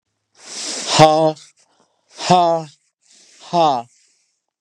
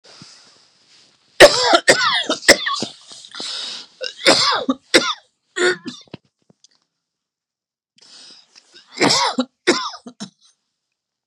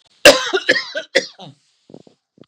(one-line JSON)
{"exhalation_length": "4.6 s", "exhalation_amplitude": 32768, "exhalation_signal_mean_std_ratio": 0.41, "three_cough_length": "11.3 s", "three_cough_amplitude": 32768, "three_cough_signal_mean_std_ratio": 0.36, "cough_length": "2.5 s", "cough_amplitude": 32768, "cough_signal_mean_std_ratio": 0.33, "survey_phase": "beta (2021-08-13 to 2022-03-07)", "age": "45-64", "gender": "Male", "wearing_mask": "No", "symptom_none": true, "smoker_status": "Never smoked", "respiratory_condition_asthma": false, "respiratory_condition_other": false, "recruitment_source": "REACT", "submission_delay": "2 days", "covid_test_result": "Negative", "covid_test_method": "RT-qPCR", "influenza_a_test_result": "Negative", "influenza_b_test_result": "Negative"}